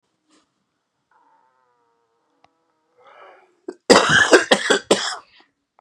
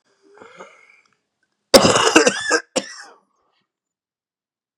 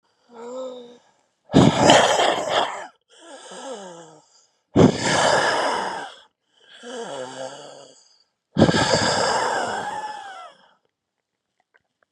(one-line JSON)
{"cough_length": "5.8 s", "cough_amplitude": 32768, "cough_signal_mean_std_ratio": 0.3, "three_cough_length": "4.8 s", "three_cough_amplitude": 32768, "three_cough_signal_mean_std_ratio": 0.3, "exhalation_length": "12.1 s", "exhalation_amplitude": 32768, "exhalation_signal_mean_std_ratio": 0.48, "survey_phase": "beta (2021-08-13 to 2022-03-07)", "age": "18-44", "gender": "Male", "wearing_mask": "No", "symptom_cough_any": true, "symptom_shortness_of_breath": true, "symptom_sore_throat": true, "symptom_abdominal_pain": true, "symptom_fatigue": true, "symptom_headache": true, "symptom_onset": "3 days", "smoker_status": "Ex-smoker", "respiratory_condition_asthma": false, "respiratory_condition_other": false, "recruitment_source": "Test and Trace", "submission_delay": "1 day", "covid_test_result": "Negative", "covid_test_method": "RT-qPCR"}